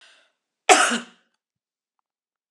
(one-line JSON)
{"cough_length": "2.5 s", "cough_amplitude": 32297, "cough_signal_mean_std_ratio": 0.25, "survey_phase": "alpha (2021-03-01 to 2021-08-12)", "age": "45-64", "gender": "Female", "wearing_mask": "No", "symptom_none": true, "smoker_status": "Never smoked", "respiratory_condition_asthma": true, "respiratory_condition_other": false, "recruitment_source": "REACT", "submission_delay": "1 day", "covid_test_result": "Negative", "covid_test_method": "RT-qPCR"}